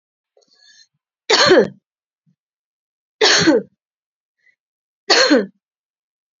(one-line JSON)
{"three_cough_length": "6.4 s", "three_cough_amplitude": 32768, "three_cough_signal_mean_std_ratio": 0.34, "survey_phase": "beta (2021-08-13 to 2022-03-07)", "age": "45-64", "gender": "Female", "wearing_mask": "No", "symptom_none": true, "smoker_status": "Never smoked", "respiratory_condition_asthma": false, "respiratory_condition_other": false, "recruitment_source": "REACT", "submission_delay": "1 day", "covid_test_result": "Negative", "covid_test_method": "RT-qPCR", "influenza_a_test_result": "Negative", "influenza_b_test_result": "Negative"}